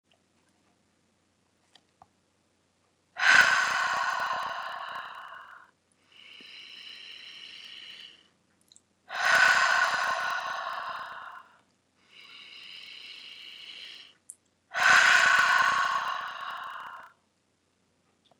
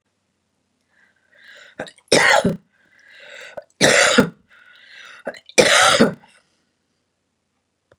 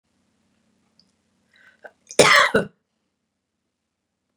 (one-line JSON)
{"exhalation_length": "18.4 s", "exhalation_amplitude": 15453, "exhalation_signal_mean_std_ratio": 0.42, "three_cough_length": "8.0 s", "three_cough_amplitude": 32768, "three_cough_signal_mean_std_ratio": 0.34, "cough_length": "4.4 s", "cough_amplitude": 32767, "cough_signal_mean_std_ratio": 0.23, "survey_phase": "beta (2021-08-13 to 2022-03-07)", "age": "45-64", "gender": "Female", "wearing_mask": "No", "symptom_runny_or_blocked_nose": true, "smoker_status": "Never smoked", "respiratory_condition_asthma": false, "respiratory_condition_other": false, "recruitment_source": "REACT", "submission_delay": "0 days", "covid_test_result": "Negative", "covid_test_method": "RT-qPCR"}